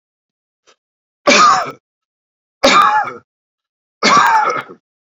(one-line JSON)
{"three_cough_length": "5.1 s", "three_cough_amplitude": 32768, "three_cough_signal_mean_std_ratio": 0.46, "survey_phase": "beta (2021-08-13 to 2022-03-07)", "age": "45-64", "gender": "Male", "wearing_mask": "No", "symptom_none": true, "smoker_status": "Current smoker (1 to 10 cigarettes per day)", "respiratory_condition_asthma": false, "respiratory_condition_other": false, "recruitment_source": "REACT", "submission_delay": "1 day", "covid_test_result": "Negative", "covid_test_method": "RT-qPCR"}